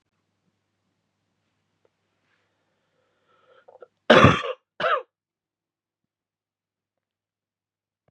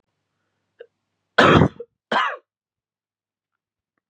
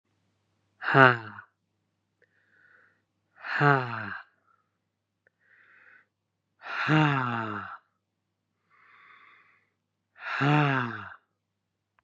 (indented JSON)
{
  "three_cough_length": "8.1 s",
  "three_cough_amplitude": 32700,
  "three_cough_signal_mean_std_ratio": 0.18,
  "cough_length": "4.1 s",
  "cough_amplitude": 32475,
  "cough_signal_mean_std_ratio": 0.27,
  "exhalation_length": "12.0 s",
  "exhalation_amplitude": 30313,
  "exhalation_signal_mean_std_ratio": 0.31,
  "survey_phase": "beta (2021-08-13 to 2022-03-07)",
  "age": "18-44",
  "gender": "Male",
  "wearing_mask": "No",
  "symptom_cough_any": true,
  "symptom_runny_or_blocked_nose": true,
  "symptom_shortness_of_breath": true,
  "symptom_sore_throat": true,
  "symptom_fatigue": true,
  "symptom_headache": true,
  "symptom_loss_of_taste": true,
  "symptom_other": true,
  "symptom_onset": "3 days",
  "smoker_status": "Never smoked",
  "respiratory_condition_asthma": false,
  "respiratory_condition_other": false,
  "recruitment_source": "Test and Trace",
  "submission_delay": "1 day",
  "covid_test_result": "Positive",
  "covid_test_method": "ePCR"
}